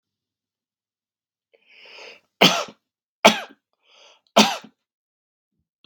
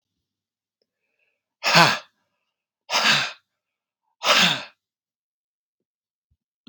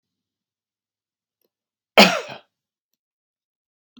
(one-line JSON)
{"three_cough_length": "5.9 s", "three_cough_amplitude": 32767, "three_cough_signal_mean_std_ratio": 0.21, "exhalation_length": "6.7 s", "exhalation_amplitude": 32767, "exhalation_signal_mean_std_ratio": 0.3, "cough_length": "4.0 s", "cough_amplitude": 32768, "cough_signal_mean_std_ratio": 0.16, "survey_phase": "beta (2021-08-13 to 2022-03-07)", "age": "45-64", "gender": "Male", "wearing_mask": "No", "symptom_none": true, "smoker_status": "Ex-smoker", "respiratory_condition_asthma": false, "respiratory_condition_other": false, "recruitment_source": "REACT", "submission_delay": "1 day", "covid_test_result": "Negative", "covid_test_method": "RT-qPCR", "influenza_a_test_result": "Unknown/Void", "influenza_b_test_result": "Unknown/Void"}